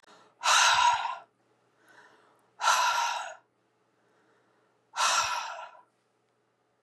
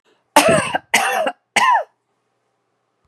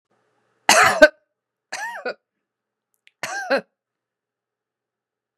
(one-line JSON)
{"exhalation_length": "6.8 s", "exhalation_amplitude": 10237, "exhalation_signal_mean_std_ratio": 0.44, "cough_length": "3.1 s", "cough_amplitude": 32768, "cough_signal_mean_std_ratio": 0.47, "three_cough_length": "5.4 s", "three_cough_amplitude": 32768, "three_cough_signal_mean_std_ratio": 0.25, "survey_phase": "beta (2021-08-13 to 2022-03-07)", "age": "45-64", "gender": "Female", "wearing_mask": "Prefer not to say", "symptom_none": true, "smoker_status": "Never smoked", "respiratory_condition_asthma": false, "respiratory_condition_other": false, "recruitment_source": "REACT", "submission_delay": "2 days", "covid_test_result": "Negative", "covid_test_method": "RT-qPCR"}